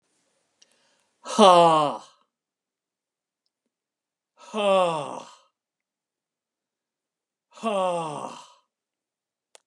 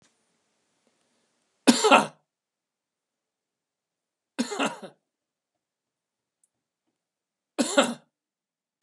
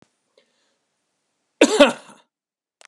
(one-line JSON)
{"exhalation_length": "9.7 s", "exhalation_amplitude": 26461, "exhalation_signal_mean_std_ratio": 0.3, "three_cough_length": "8.8 s", "three_cough_amplitude": 29115, "three_cough_signal_mean_std_ratio": 0.21, "cough_length": "2.9 s", "cough_amplitude": 32767, "cough_signal_mean_std_ratio": 0.22, "survey_phase": "beta (2021-08-13 to 2022-03-07)", "age": "65+", "gender": "Male", "wearing_mask": "No", "symptom_cough_any": true, "smoker_status": "Never smoked", "respiratory_condition_asthma": false, "respiratory_condition_other": false, "recruitment_source": "REACT", "submission_delay": "1 day", "covid_test_result": "Negative", "covid_test_method": "RT-qPCR", "influenza_a_test_result": "Negative", "influenza_b_test_result": "Negative"}